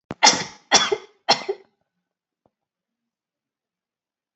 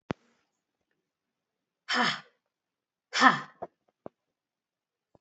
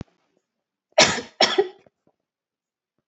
{"three_cough_length": "4.4 s", "three_cough_amplitude": 30652, "three_cough_signal_mean_std_ratio": 0.26, "exhalation_length": "5.2 s", "exhalation_amplitude": 23782, "exhalation_signal_mean_std_ratio": 0.22, "cough_length": "3.1 s", "cough_amplitude": 30331, "cough_signal_mean_std_ratio": 0.27, "survey_phase": "beta (2021-08-13 to 2022-03-07)", "age": "45-64", "gender": "Female", "wearing_mask": "No", "symptom_none": true, "smoker_status": "Never smoked", "respiratory_condition_asthma": false, "respiratory_condition_other": false, "recruitment_source": "REACT", "submission_delay": "9 days", "covid_test_result": "Negative", "covid_test_method": "RT-qPCR"}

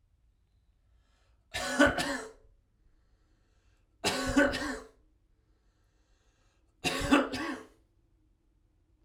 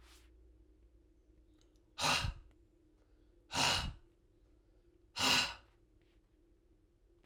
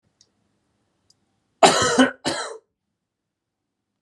{"three_cough_length": "9.0 s", "three_cough_amplitude": 11224, "three_cough_signal_mean_std_ratio": 0.35, "exhalation_length": "7.3 s", "exhalation_amplitude": 4472, "exhalation_signal_mean_std_ratio": 0.34, "cough_length": "4.0 s", "cough_amplitude": 32555, "cough_signal_mean_std_ratio": 0.29, "survey_phase": "alpha (2021-03-01 to 2021-08-12)", "age": "45-64", "gender": "Male", "wearing_mask": "No", "symptom_cough_any": true, "symptom_fever_high_temperature": true, "symptom_headache": true, "symptom_onset": "2 days", "smoker_status": "Never smoked", "respiratory_condition_asthma": false, "respiratory_condition_other": true, "recruitment_source": "Test and Trace", "submission_delay": "2 days", "covid_test_result": "Positive", "covid_test_method": "RT-qPCR"}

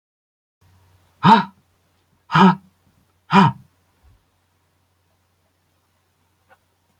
{"exhalation_length": "7.0 s", "exhalation_amplitude": 29462, "exhalation_signal_mean_std_ratio": 0.24, "survey_phase": "beta (2021-08-13 to 2022-03-07)", "age": "65+", "gender": "Male", "wearing_mask": "No", "symptom_none": true, "smoker_status": "Never smoked", "respiratory_condition_asthma": false, "respiratory_condition_other": false, "recruitment_source": "REACT", "submission_delay": "2 days", "covid_test_result": "Negative", "covid_test_method": "RT-qPCR"}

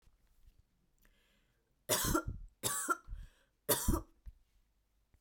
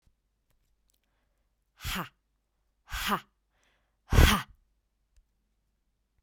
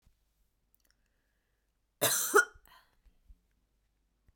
{"three_cough_length": "5.2 s", "three_cough_amplitude": 5484, "three_cough_signal_mean_std_ratio": 0.38, "exhalation_length": "6.2 s", "exhalation_amplitude": 15786, "exhalation_signal_mean_std_ratio": 0.22, "cough_length": "4.4 s", "cough_amplitude": 9812, "cough_signal_mean_std_ratio": 0.23, "survey_phase": "beta (2021-08-13 to 2022-03-07)", "age": "18-44", "gender": "Female", "wearing_mask": "No", "symptom_none": true, "symptom_onset": "10 days", "smoker_status": "Never smoked", "respiratory_condition_asthma": false, "respiratory_condition_other": false, "recruitment_source": "REACT", "submission_delay": "1 day", "covid_test_result": "Negative", "covid_test_method": "RT-qPCR"}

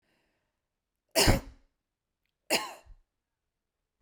{"cough_length": "4.0 s", "cough_amplitude": 15624, "cough_signal_mean_std_ratio": 0.24, "survey_phase": "beta (2021-08-13 to 2022-03-07)", "age": "45-64", "gender": "Female", "wearing_mask": "No", "symptom_none": true, "symptom_onset": "12 days", "smoker_status": "Never smoked", "respiratory_condition_asthma": false, "respiratory_condition_other": false, "recruitment_source": "REACT", "submission_delay": "2 days", "covid_test_result": "Negative", "covid_test_method": "RT-qPCR"}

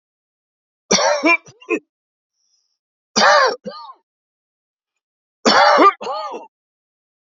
{"three_cough_length": "7.3 s", "three_cough_amplitude": 29191, "three_cough_signal_mean_std_ratio": 0.38, "survey_phase": "beta (2021-08-13 to 2022-03-07)", "age": "45-64", "gender": "Male", "wearing_mask": "No", "symptom_cough_any": true, "symptom_runny_or_blocked_nose": true, "symptom_onset": "12 days", "smoker_status": "Ex-smoker", "respiratory_condition_asthma": false, "respiratory_condition_other": false, "recruitment_source": "REACT", "submission_delay": "1 day", "covid_test_result": "Negative", "covid_test_method": "RT-qPCR", "influenza_a_test_result": "Negative", "influenza_b_test_result": "Negative"}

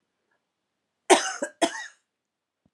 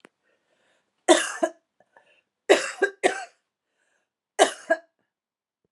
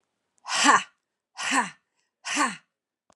{"cough_length": "2.7 s", "cough_amplitude": 23628, "cough_signal_mean_std_ratio": 0.25, "three_cough_length": "5.7 s", "three_cough_amplitude": 28322, "three_cough_signal_mean_std_ratio": 0.27, "exhalation_length": "3.2 s", "exhalation_amplitude": 20387, "exhalation_signal_mean_std_ratio": 0.38, "survey_phase": "beta (2021-08-13 to 2022-03-07)", "age": "45-64", "gender": "Female", "wearing_mask": "No", "symptom_new_continuous_cough": true, "symptom_runny_or_blocked_nose": true, "symptom_sore_throat": true, "symptom_abdominal_pain": true, "symptom_fatigue": true, "symptom_headache": true, "symptom_onset": "3 days", "smoker_status": "Never smoked", "respiratory_condition_asthma": false, "respiratory_condition_other": false, "recruitment_source": "Test and Trace", "submission_delay": "2 days", "covid_test_result": "Positive", "covid_test_method": "RT-qPCR", "covid_ct_value": 27.8, "covid_ct_gene": "ORF1ab gene"}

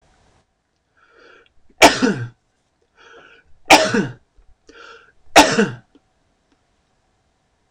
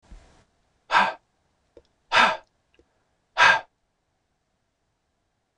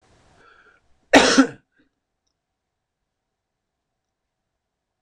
{"three_cough_length": "7.7 s", "three_cough_amplitude": 26028, "three_cough_signal_mean_std_ratio": 0.27, "exhalation_length": "5.6 s", "exhalation_amplitude": 20861, "exhalation_signal_mean_std_ratio": 0.27, "cough_length": "5.0 s", "cough_amplitude": 26028, "cough_signal_mean_std_ratio": 0.2, "survey_phase": "beta (2021-08-13 to 2022-03-07)", "age": "45-64", "gender": "Male", "wearing_mask": "No", "symptom_none": true, "smoker_status": "Never smoked", "respiratory_condition_asthma": false, "respiratory_condition_other": false, "recruitment_source": "REACT", "submission_delay": "6 days", "covid_test_result": "Negative", "covid_test_method": "RT-qPCR", "influenza_a_test_result": "Negative", "influenza_b_test_result": "Negative"}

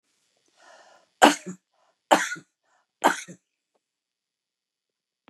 {"three_cough_length": "5.3 s", "three_cough_amplitude": 32767, "three_cough_signal_mean_std_ratio": 0.2, "survey_phase": "beta (2021-08-13 to 2022-03-07)", "age": "65+", "gender": "Female", "wearing_mask": "No", "symptom_shortness_of_breath": true, "smoker_status": "Ex-smoker", "respiratory_condition_asthma": false, "respiratory_condition_other": false, "recruitment_source": "REACT", "submission_delay": "1 day", "covid_test_result": "Negative", "covid_test_method": "RT-qPCR", "influenza_a_test_result": "Negative", "influenza_b_test_result": "Negative"}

